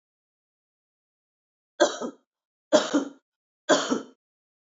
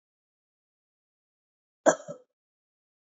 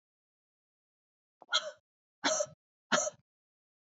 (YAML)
three_cough_length: 4.7 s
three_cough_amplitude: 19367
three_cough_signal_mean_std_ratio: 0.29
cough_length: 3.1 s
cough_amplitude: 20212
cough_signal_mean_std_ratio: 0.14
exhalation_length: 3.8 s
exhalation_amplitude: 7912
exhalation_signal_mean_std_ratio: 0.29
survey_phase: beta (2021-08-13 to 2022-03-07)
age: 45-64
gender: Female
wearing_mask: 'No'
symptom_cough_any: true
symptom_runny_or_blocked_nose: true
symptom_onset: 4 days
smoker_status: Never smoked
respiratory_condition_asthma: false
respiratory_condition_other: false
recruitment_source: Test and Trace
submission_delay: 2 days
covid_test_result: Positive
covid_test_method: RT-qPCR
covid_ct_value: 20.3
covid_ct_gene: N gene
covid_ct_mean: 20.4
covid_viral_load: 210000 copies/ml
covid_viral_load_category: Low viral load (10K-1M copies/ml)